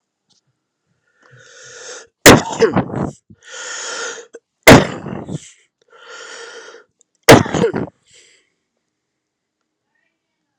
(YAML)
three_cough_length: 10.6 s
three_cough_amplitude: 32768
three_cough_signal_mean_std_ratio: 0.28
survey_phase: alpha (2021-03-01 to 2021-08-12)
age: 45-64
gender: Male
wearing_mask: 'No'
symptom_headache: true
smoker_status: Never smoked
respiratory_condition_asthma: false
respiratory_condition_other: false
recruitment_source: Test and Trace
submission_delay: 2 days
covid_test_result: Positive
covid_test_method: RT-qPCR
covid_ct_value: 13.4
covid_ct_gene: N gene
covid_ct_mean: 13.8
covid_viral_load: 29000000 copies/ml
covid_viral_load_category: High viral load (>1M copies/ml)